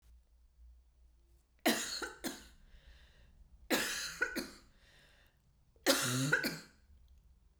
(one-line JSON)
{"three_cough_length": "7.6 s", "three_cough_amplitude": 6597, "three_cough_signal_mean_std_ratio": 0.42, "survey_phase": "beta (2021-08-13 to 2022-03-07)", "age": "45-64", "gender": "Female", "wearing_mask": "No", "symptom_cough_any": true, "symptom_runny_or_blocked_nose": true, "symptom_sore_throat": true, "symptom_fatigue": true, "symptom_headache": true, "smoker_status": "Never smoked", "respiratory_condition_asthma": true, "respiratory_condition_other": false, "recruitment_source": "Test and Trace", "submission_delay": "2 days", "covid_test_result": "Positive", "covid_test_method": "ePCR"}